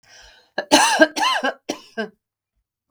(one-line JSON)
{"three_cough_length": "2.9 s", "three_cough_amplitude": 32768, "three_cough_signal_mean_std_ratio": 0.41, "survey_phase": "beta (2021-08-13 to 2022-03-07)", "age": "45-64", "gender": "Female", "wearing_mask": "No", "symptom_none": true, "smoker_status": "Never smoked", "respiratory_condition_asthma": false, "respiratory_condition_other": false, "recruitment_source": "REACT", "submission_delay": "1 day", "covid_test_result": "Negative", "covid_test_method": "RT-qPCR"}